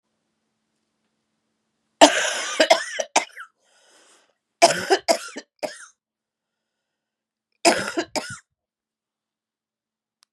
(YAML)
cough_length: 10.3 s
cough_amplitude: 32768
cough_signal_mean_std_ratio: 0.27
survey_phase: beta (2021-08-13 to 2022-03-07)
age: 45-64
gender: Female
wearing_mask: 'No'
symptom_cough_any: true
symptom_runny_or_blocked_nose: true
symptom_abdominal_pain: true
symptom_fatigue: true
symptom_fever_high_temperature: true
symptom_headache: true
symptom_change_to_sense_of_smell_or_taste: true
smoker_status: Never smoked
respiratory_condition_asthma: false
respiratory_condition_other: false
recruitment_source: Test and Trace
submission_delay: 1 day
covid_test_result: Positive
covid_test_method: LFT